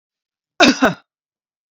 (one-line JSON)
{"cough_length": "1.7 s", "cough_amplitude": 32768, "cough_signal_mean_std_ratio": 0.31, "survey_phase": "beta (2021-08-13 to 2022-03-07)", "age": "45-64", "gender": "Female", "wearing_mask": "No", "symptom_none": true, "smoker_status": "Ex-smoker", "respiratory_condition_asthma": false, "respiratory_condition_other": false, "recruitment_source": "REACT", "submission_delay": "2 days", "covid_test_result": "Negative", "covid_test_method": "RT-qPCR"}